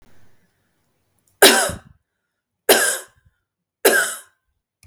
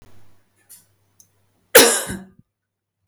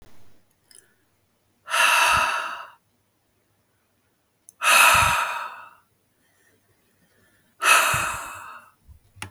{
  "three_cough_length": "4.9 s",
  "three_cough_amplitude": 32768,
  "three_cough_signal_mean_std_ratio": 0.32,
  "cough_length": "3.1 s",
  "cough_amplitude": 32768,
  "cough_signal_mean_std_ratio": 0.25,
  "exhalation_length": "9.3 s",
  "exhalation_amplitude": 23743,
  "exhalation_signal_mean_std_ratio": 0.4,
  "survey_phase": "beta (2021-08-13 to 2022-03-07)",
  "age": "18-44",
  "gender": "Female",
  "wearing_mask": "No",
  "symptom_none": true,
  "smoker_status": "Never smoked",
  "respiratory_condition_asthma": false,
  "respiratory_condition_other": false,
  "recruitment_source": "REACT",
  "submission_delay": "3 days",
  "covid_test_result": "Negative",
  "covid_test_method": "RT-qPCR",
  "influenza_a_test_result": "Negative",
  "influenza_b_test_result": "Negative"
}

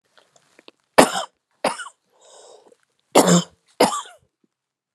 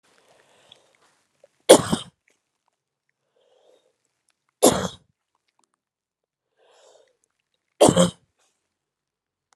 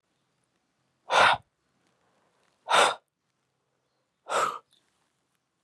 {
  "cough_length": "4.9 s",
  "cough_amplitude": 32768,
  "cough_signal_mean_std_ratio": 0.29,
  "three_cough_length": "9.6 s",
  "three_cough_amplitude": 32768,
  "three_cough_signal_mean_std_ratio": 0.19,
  "exhalation_length": "5.6 s",
  "exhalation_amplitude": 15021,
  "exhalation_signal_mean_std_ratio": 0.28,
  "survey_phase": "alpha (2021-03-01 to 2021-08-12)",
  "age": "45-64",
  "gender": "Female",
  "wearing_mask": "No",
  "symptom_none": true,
  "smoker_status": "Ex-smoker",
  "respiratory_condition_asthma": false,
  "respiratory_condition_other": false,
  "recruitment_source": "REACT",
  "submission_delay": "2 days",
  "covid_test_result": "Negative",
  "covid_test_method": "RT-qPCR"
}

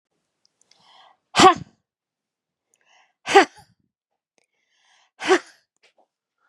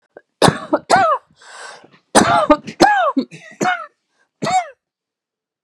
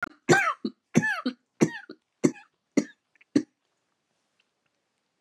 {
  "exhalation_length": "6.5 s",
  "exhalation_amplitude": 32348,
  "exhalation_signal_mean_std_ratio": 0.2,
  "cough_length": "5.6 s",
  "cough_amplitude": 32768,
  "cough_signal_mean_std_ratio": 0.45,
  "three_cough_length": "5.2 s",
  "three_cough_amplitude": 19007,
  "three_cough_signal_mean_std_ratio": 0.3,
  "survey_phase": "beta (2021-08-13 to 2022-03-07)",
  "age": "65+",
  "gender": "Female",
  "wearing_mask": "No",
  "symptom_none": true,
  "smoker_status": "Never smoked",
  "respiratory_condition_asthma": false,
  "respiratory_condition_other": false,
  "recruitment_source": "REACT",
  "submission_delay": "2 days",
  "covid_test_result": "Negative",
  "covid_test_method": "RT-qPCR",
  "influenza_a_test_result": "Negative",
  "influenza_b_test_result": "Negative"
}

